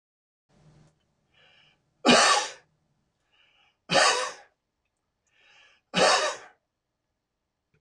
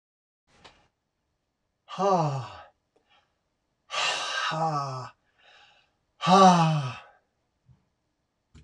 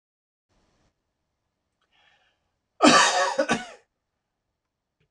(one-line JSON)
{"three_cough_length": "7.8 s", "three_cough_amplitude": 18567, "three_cough_signal_mean_std_ratio": 0.31, "exhalation_length": "8.6 s", "exhalation_amplitude": 20357, "exhalation_signal_mean_std_ratio": 0.37, "cough_length": "5.1 s", "cough_amplitude": 23885, "cough_signal_mean_std_ratio": 0.28, "survey_phase": "beta (2021-08-13 to 2022-03-07)", "age": "65+", "gender": "Female", "wearing_mask": "No", "symptom_runny_or_blocked_nose": true, "symptom_other": true, "smoker_status": "Never smoked", "respiratory_condition_asthma": false, "respiratory_condition_other": false, "recruitment_source": "Test and Trace", "submission_delay": "2 days", "covid_test_method": "RT-qPCR", "covid_ct_value": 30.4, "covid_ct_gene": "S gene", "covid_ct_mean": 30.6, "covid_viral_load": "95 copies/ml", "covid_viral_load_category": "Minimal viral load (< 10K copies/ml)"}